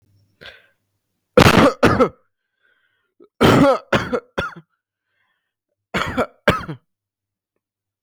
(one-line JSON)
{"three_cough_length": "8.0 s", "three_cough_amplitude": 32768, "three_cough_signal_mean_std_ratio": 0.35, "survey_phase": "beta (2021-08-13 to 2022-03-07)", "age": "18-44", "gender": "Male", "wearing_mask": "No", "symptom_none": true, "smoker_status": "Ex-smoker", "respiratory_condition_asthma": false, "respiratory_condition_other": false, "recruitment_source": "REACT", "submission_delay": "2 days", "covid_test_result": "Negative", "covid_test_method": "RT-qPCR", "influenza_a_test_result": "Negative", "influenza_b_test_result": "Negative"}